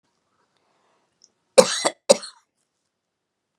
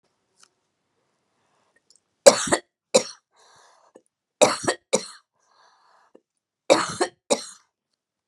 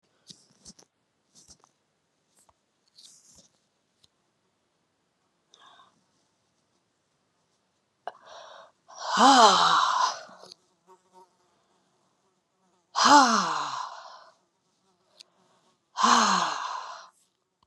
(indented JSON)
{
  "cough_length": "3.6 s",
  "cough_amplitude": 32768,
  "cough_signal_mean_std_ratio": 0.18,
  "three_cough_length": "8.3 s",
  "three_cough_amplitude": 32768,
  "three_cough_signal_mean_std_ratio": 0.22,
  "exhalation_length": "17.7 s",
  "exhalation_amplitude": 21171,
  "exhalation_signal_mean_std_ratio": 0.3,
  "survey_phase": "beta (2021-08-13 to 2022-03-07)",
  "age": "45-64",
  "gender": "Female",
  "wearing_mask": "No",
  "symptom_none": true,
  "symptom_onset": "6 days",
  "smoker_status": "Never smoked",
  "respiratory_condition_asthma": false,
  "respiratory_condition_other": false,
  "recruitment_source": "REACT",
  "submission_delay": "1 day",
  "covid_test_result": "Negative",
  "covid_test_method": "RT-qPCR"
}